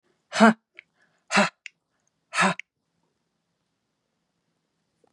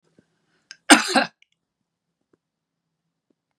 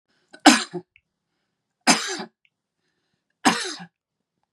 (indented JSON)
{
  "exhalation_length": "5.1 s",
  "exhalation_amplitude": 29025,
  "exhalation_signal_mean_std_ratio": 0.23,
  "cough_length": "3.6 s",
  "cough_amplitude": 32768,
  "cough_signal_mean_std_ratio": 0.19,
  "three_cough_length": "4.5 s",
  "three_cough_amplitude": 32766,
  "three_cough_signal_mean_std_ratio": 0.26,
  "survey_phase": "beta (2021-08-13 to 2022-03-07)",
  "age": "45-64",
  "gender": "Female",
  "wearing_mask": "No",
  "symptom_none": true,
  "smoker_status": "Ex-smoker",
  "respiratory_condition_asthma": false,
  "respiratory_condition_other": false,
  "recruitment_source": "REACT",
  "submission_delay": "2 days",
  "covid_test_result": "Negative",
  "covid_test_method": "RT-qPCR",
  "influenza_a_test_result": "Negative",
  "influenza_b_test_result": "Negative"
}